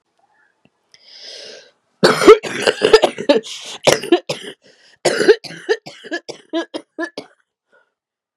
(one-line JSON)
{"cough_length": "8.4 s", "cough_amplitude": 32768, "cough_signal_mean_std_ratio": 0.35, "survey_phase": "beta (2021-08-13 to 2022-03-07)", "age": "45-64", "gender": "Female", "wearing_mask": "Yes", "symptom_cough_any": true, "symptom_runny_or_blocked_nose": true, "symptom_diarrhoea": true, "symptom_fatigue": true, "symptom_headache": true, "symptom_change_to_sense_of_smell_or_taste": true, "smoker_status": "Never smoked", "respiratory_condition_asthma": false, "respiratory_condition_other": false, "recruitment_source": "Test and Trace", "submission_delay": "1 day", "covid_test_result": "Positive", "covid_test_method": "RT-qPCR", "covid_ct_value": 26.2, "covid_ct_gene": "ORF1ab gene", "covid_ct_mean": 26.8, "covid_viral_load": "1600 copies/ml", "covid_viral_load_category": "Minimal viral load (< 10K copies/ml)"}